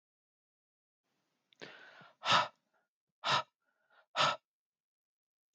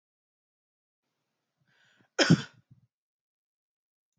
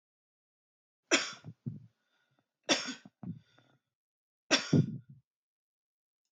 exhalation_length: 5.5 s
exhalation_amplitude: 5976
exhalation_signal_mean_std_ratio: 0.26
cough_length: 4.2 s
cough_amplitude: 12927
cough_signal_mean_std_ratio: 0.16
three_cough_length: 6.3 s
three_cough_amplitude: 9730
three_cough_signal_mean_std_ratio: 0.27
survey_phase: alpha (2021-03-01 to 2021-08-12)
age: 45-64
gender: Male
wearing_mask: 'No'
symptom_none: true
smoker_status: Ex-smoker
respiratory_condition_asthma: false
respiratory_condition_other: false
recruitment_source: REACT
submission_delay: 1 day
covid_test_result: Negative
covid_test_method: RT-qPCR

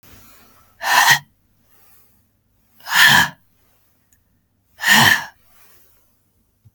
exhalation_length: 6.7 s
exhalation_amplitude: 32768
exhalation_signal_mean_std_ratio: 0.33
survey_phase: beta (2021-08-13 to 2022-03-07)
age: 45-64
gender: Female
wearing_mask: 'No'
symptom_none: true
smoker_status: Never smoked
respiratory_condition_asthma: false
respiratory_condition_other: false
recruitment_source: Test and Trace
submission_delay: 1 day
covid_test_result: Negative
covid_test_method: LFT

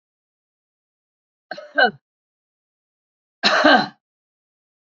cough_length: 4.9 s
cough_amplitude: 28465
cough_signal_mean_std_ratio: 0.26
survey_phase: beta (2021-08-13 to 2022-03-07)
age: 65+
gender: Female
wearing_mask: 'No'
symptom_none: true
smoker_status: Current smoker (11 or more cigarettes per day)
respiratory_condition_asthma: false
respiratory_condition_other: false
recruitment_source: Test and Trace
submission_delay: 1 day
covid_test_result: Positive
covid_test_method: RT-qPCR
covid_ct_value: 24.7
covid_ct_gene: N gene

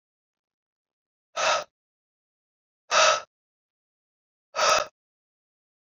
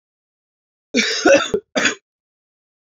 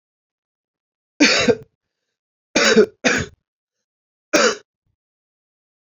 exhalation_length: 5.8 s
exhalation_amplitude: 14991
exhalation_signal_mean_std_ratio: 0.29
cough_length: 2.8 s
cough_amplitude: 28801
cough_signal_mean_std_ratio: 0.39
three_cough_length: 5.8 s
three_cough_amplitude: 30395
three_cough_signal_mean_std_ratio: 0.34
survey_phase: alpha (2021-03-01 to 2021-08-12)
age: 18-44
gender: Male
wearing_mask: 'No'
symptom_cough_any: true
symptom_fatigue: true
symptom_fever_high_temperature: true
symptom_onset: 4 days
smoker_status: Ex-smoker
respiratory_condition_asthma: false
respiratory_condition_other: false
recruitment_source: Test and Trace
submission_delay: 1 day
covid_test_result: Positive
covid_test_method: RT-qPCR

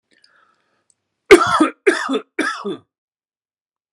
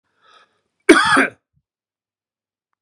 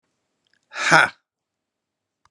three_cough_length: 3.9 s
three_cough_amplitude: 32768
three_cough_signal_mean_std_ratio: 0.32
cough_length: 2.8 s
cough_amplitude: 32768
cough_signal_mean_std_ratio: 0.28
exhalation_length: 2.3 s
exhalation_amplitude: 32767
exhalation_signal_mean_std_ratio: 0.25
survey_phase: beta (2021-08-13 to 2022-03-07)
age: 45-64
gender: Male
wearing_mask: 'No'
symptom_cough_any: true
symptom_runny_or_blocked_nose: true
symptom_headache: true
smoker_status: Ex-smoker
respiratory_condition_asthma: false
respiratory_condition_other: false
recruitment_source: Test and Trace
submission_delay: 2 days
covid_test_result: Positive
covid_test_method: RT-qPCR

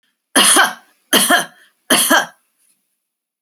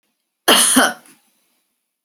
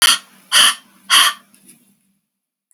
three_cough_length: 3.4 s
three_cough_amplitude: 32768
three_cough_signal_mean_std_ratio: 0.45
cough_length: 2.0 s
cough_amplitude: 32767
cough_signal_mean_std_ratio: 0.38
exhalation_length: 2.7 s
exhalation_amplitude: 32768
exhalation_signal_mean_std_ratio: 0.39
survey_phase: beta (2021-08-13 to 2022-03-07)
age: 65+
gender: Female
wearing_mask: 'No'
symptom_none: true
smoker_status: Never smoked
respiratory_condition_asthma: false
respiratory_condition_other: false
recruitment_source: Test and Trace
submission_delay: 5 days
covid_test_result: Negative
covid_test_method: LFT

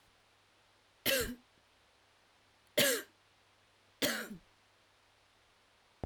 three_cough_length: 6.1 s
three_cough_amplitude: 6333
three_cough_signal_mean_std_ratio: 0.3
survey_phase: beta (2021-08-13 to 2022-03-07)
age: 45-64
gender: Female
wearing_mask: 'No'
symptom_cough_any: true
symptom_runny_or_blocked_nose: true
symptom_sore_throat: true
symptom_onset: 12 days
smoker_status: Never smoked
respiratory_condition_asthma: false
respiratory_condition_other: false
recruitment_source: REACT
submission_delay: 2 days
covid_test_result: Negative
covid_test_method: RT-qPCR
influenza_a_test_result: Negative
influenza_b_test_result: Negative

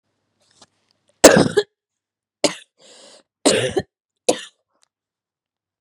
three_cough_length: 5.8 s
three_cough_amplitude: 32768
three_cough_signal_mean_std_ratio: 0.25
survey_phase: beta (2021-08-13 to 2022-03-07)
age: 18-44
gender: Female
wearing_mask: 'No'
symptom_cough_any: true
symptom_fatigue: true
symptom_headache: true
symptom_other: true
symptom_onset: 4 days
smoker_status: Ex-smoker
respiratory_condition_asthma: false
respiratory_condition_other: false
recruitment_source: Test and Trace
submission_delay: 1 day
covid_test_result: Positive
covid_test_method: ePCR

